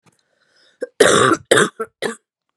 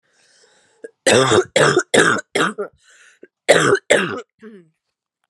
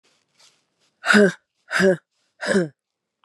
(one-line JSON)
{"cough_length": "2.6 s", "cough_amplitude": 32768, "cough_signal_mean_std_ratio": 0.4, "three_cough_length": "5.3 s", "three_cough_amplitude": 32768, "three_cough_signal_mean_std_ratio": 0.45, "exhalation_length": "3.2 s", "exhalation_amplitude": 27208, "exhalation_signal_mean_std_ratio": 0.37, "survey_phase": "beta (2021-08-13 to 2022-03-07)", "age": "18-44", "gender": "Female", "wearing_mask": "No", "symptom_cough_any": true, "symptom_new_continuous_cough": true, "symptom_runny_or_blocked_nose": true, "symptom_sore_throat": true, "symptom_abdominal_pain": true, "symptom_fatigue": true, "symptom_fever_high_temperature": true, "symptom_headache": true, "symptom_loss_of_taste": true, "symptom_onset": "3 days", "smoker_status": "Current smoker (e-cigarettes or vapes only)", "respiratory_condition_asthma": false, "respiratory_condition_other": false, "recruitment_source": "Test and Trace", "submission_delay": "2 days", "covid_test_result": "Positive", "covid_test_method": "RT-qPCR", "covid_ct_value": 18.5, "covid_ct_gene": "ORF1ab gene", "covid_ct_mean": 19.0, "covid_viral_load": "580000 copies/ml", "covid_viral_load_category": "Low viral load (10K-1M copies/ml)"}